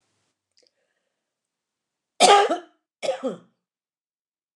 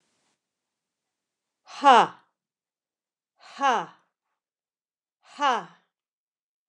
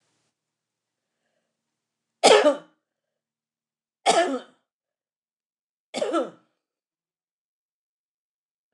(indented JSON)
{
  "cough_length": "4.6 s",
  "cough_amplitude": 26962,
  "cough_signal_mean_std_ratio": 0.25,
  "exhalation_length": "6.7 s",
  "exhalation_amplitude": 23663,
  "exhalation_signal_mean_std_ratio": 0.22,
  "three_cough_length": "8.7 s",
  "three_cough_amplitude": 26799,
  "three_cough_signal_mean_std_ratio": 0.23,
  "survey_phase": "beta (2021-08-13 to 2022-03-07)",
  "age": "45-64",
  "gender": "Female",
  "wearing_mask": "No",
  "symptom_none": true,
  "smoker_status": "Ex-smoker",
  "respiratory_condition_asthma": false,
  "respiratory_condition_other": false,
  "recruitment_source": "REACT",
  "submission_delay": "1 day",
  "covid_test_result": "Negative",
  "covid_test_method": "RT-qPCR"
}